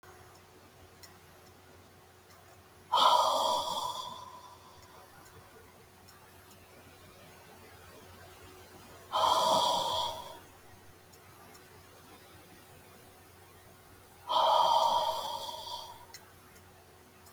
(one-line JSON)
{"exhalation_length": "17.3 s", "exhalation_amplitude": 9057, "exhalation_signal_mean_std_ratio": 0.43, "survey_phase": "beta (2021-08-13 to 2022-03-07)", "age": "65+", "gender": "Female", "wearing_mask": "No", "symptom_none": true, "smoker_status": "Never smoked", "respiratory_condition_asthma": false, "respiratory_condition_other": false, "recruitment_source": "REACT", "submission_delay": "2 days", "covid_test_result": "Negative", "covid_test_method": "RT-qPCR"}